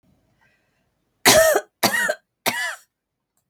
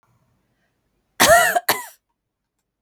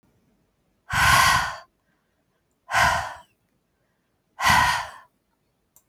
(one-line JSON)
{"three_cough_length": "3.5 s", "three_cough_amplitude": 32768, "three_cough_signal_mean_std_ratio": 0.38, "cough_length": "2.8 s", "cough_amplitude": 32766, "cough_signal_mean_std_ratio": 0.32, "exhalation_length": "5.9 s", "exhalation_amplitude": 17798, "exhalation_signal_mean_std_ratio": 0.4, "survey_phase": "beta (2021-08-13 to 2022-03-07)", "age": "65+", "gender": "Female", "wearing_mask": "No", "symptom_cough_any": true, "symptom_runny_or_blocked_nose": true, "symptom_fatigue": true, "symptom_onset": "9 days", "smoker_status": "Ex-smoker", "respiratory_condition_asthma": false, "respiratory_condition_other": false, "recruitment_source": "REACT", "submission_delay": "2 days", "covid_test_result": "Negative", "covid_test_method": "RT-qPCR", "influenza_a_test_result": "Negative", "influenza_b_test_result": "Negative"}